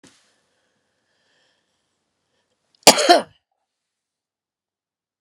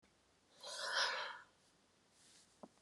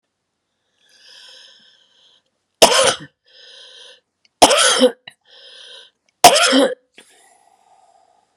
{
  "cough_length": "5.2 s",
  "cough_amplitude": 32768,
  "cough_signal_mean_std_ratio": 0.17,
  "exhalation_length": "2.8 s",
  "exhalation_amplitude": 1881,
  "exhalation_signal_mean_std_ratio": 0.43,
  "three_cough_length": "8.4 s",
  "three_cough_amplitude": 32768,
  "three_cough_signal_mean_std_ratio": 0.31,
  "survey_phase": "beta (2021-08-13 to 2022-03-07)",
  "age": "65+",
  "gender": "Female",
  "wearing_mask": "No",
  "symptom_cough_any": true,
  "symptom_runny_or_blocked_nose": true,
  "symptom_onset": "2 days",
  "smoker_status": "Never smoked",
  "respiratory_condition_asthma": false,
  "respiratory_condition_other": false,
  "recruitment_source": "Test and Trace",
  "submission_delay": "1 day",
  "covid_test_result": "Positive",
  "covid_test_method": "RT-qPCR"
}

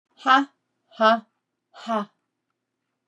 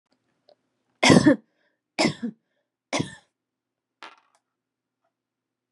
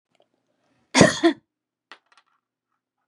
{
  "exhalation_length": "3.1 s",
  "exhalation_amplitude": 20427,
  "exhalation_signal_mean_std_ratio": 0.32,
  "three_cough_length": "5.7 s",
  "three_cough_amplitude": 25415,
  "three_cough_signal_mean_std_ratio": 0.24,
  "cough_length": "3.1 s",
  "cough_amplitude": 32768,
  "cough_signal_mean_std_ratio": 0.23,
  "survey_phase": "beta (2021-08-13 to 2022-03-07)",
  "age": "45-64",
  "gender": "Female",
  "wearing_mask": "No",
  "symptom_fatigue": true,
  "symptom_headache": true,
  "symptom_onset": "11 days",
  "smoker_status": "Never smoked",
  "respiratory_condition_asthma": false,
  "respiratory_condition_other": false,
  "recruitment_source": "REACT",
  "submission_delay": "1 day",
  "covid_test_result": "Negative",
  "covid_test_method": "RT-qPCR",
  "influenza_a_test_result": "Negative",
  "influenza_b_test_result": "Negative"
}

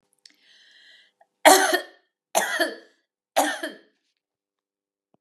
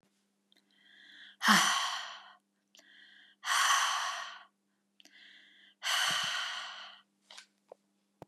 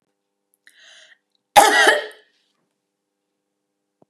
{
  "three_cough_length": "5.2 s",
  "three_cough_amplitude": 32742,
  "three_cough_signal_mean_std_ratio": 0.29,
  "exhalation_length": "8.3 s",
  "exhalation_amplitude": 9823,
  "exhalation_signal_mean_std_ratio": 0.43,
  "cough_length": "4.1 s",
  "cough_amplitude": 32768,
  "cough_signal_mean_std_ratio": 0.26,
  "survey_phase": "beta (2021-08-13 to 2022-03-07)",
  "age": "45-64",
  "gender": "Female",
  "wearing_mask": "No",
  "symptom_none": true,
  "smoker_status": "Ex-smoker",
  "respiratory_condition_asthma": false,
  "respiratory_condition_other": false,
  "recruitment_source": "REACT",
  "submission_delay": "1 day",
  "covid_test_result": "Negative",
  "covid_test_method": "RT-qPCR",
  "influenza_a_test_result": "Negative",
  "influenza_b_test_result": "Negative"
}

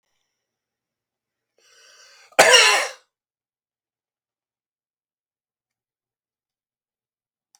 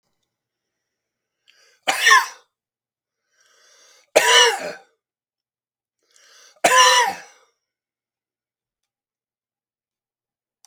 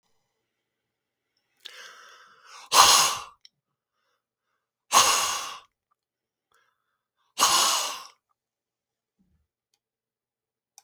{
  "cough_length": "7.6 s",
  "cough_amplitude": 32767,
  "cough_signal_mean_std_ratio": 0.19,
  "three_cough_length": "10.7 s",
  "three_cough_amplitude": 32766,
  "three_cough_signal_mean_std_ratio": 0.27,
  "exhalation_length": "10.8 s",
  "exhalation_amplitude": 32500,
  "exhalation_signal_mean_std_ratio": 0.28,
  "survey_phase": "beta (2021-08-13 to 2022-03-07)",
  "age": "45-64",
  "gender": "Male",
  "wearing_mask": "No",
  "symptom_none": true,
  "smoker_status": "Never smoked",
  "respiratory_condition_asthma": true,
  "respiratory_condition_other": false,
  "recruitment_source": "REACT",
  "submission_delay": "1 day",
  "covid_test_result": "Negative",
  "covid_test_method": "RT-qPCR"
}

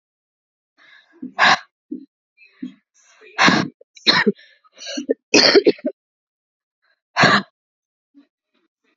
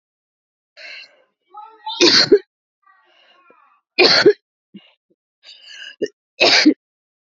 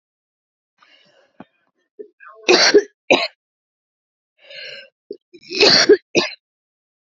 {
  "exhalation_length": "9.0 s",
  "exhalation_amplitude": 32767,
  "exhalation_signal_mean_std_ratio": 0.32,
  "three_cough_length": "7.3 s",
  "three_cough_amplitude": 32594,
  "three_cough_signal_mean_std_ratio": 0.33,
  "cough_length": "7.1 s",
  "cough_amplitude": 32768,
  "cough_signal_mean_std_ratio": 0.31,
  "survey_phase": "beta (2021-08-13 to 2022-03-07)",
  "age": "18-44",
  "gender": "Female",
  "wearing_mask": "No",
  "symptom_cough_any": true,
  "symptom_runny_or_blocked_nose": true,
  "symptom_headache": true,
  "symptom_change_to_sense_of_smell_or_taste": true,
  "symptom_loss_of_taste": true,
  "symptom_onset": "2 days",
  "smoker_status": "Never smoked",
  "respiratory_condition_asthma": false,
  "respiratory_condition_other": false,
  "recruitment_source": "Test and Trace",
  "submission_delay": "1 day",
  "covid_test_result": "Positive",
  "covid_test_method": "RT-qPCR"
}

